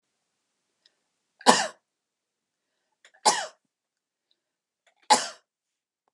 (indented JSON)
{
  "three_cough_length": "6.1 s",
  "three_cough_amplitude": 32087,
  "three_cough_signal_mean_std_ratio": 0.2,
  "survey_phase": "beta (2021-08-13 to 2022-03-07)",
  "age": "45-64",
  "gender": "Female",
  "wearing_mask": "No",
  "symptom_none": true,
  "smoker_status": "Ex-smoker",
  "respiratory_condition_asthma": false,
  "respiratory_condition_other": false,
  "recruitment_source": "REACT",
  "submission_delay": "1 day",
  "covid_test_result": "Negative",
  "covid_test_method": "RT-qPCR",
  "influenza_a_test_result": "Negative",
  "influenza_b_test_result": "Negative"
}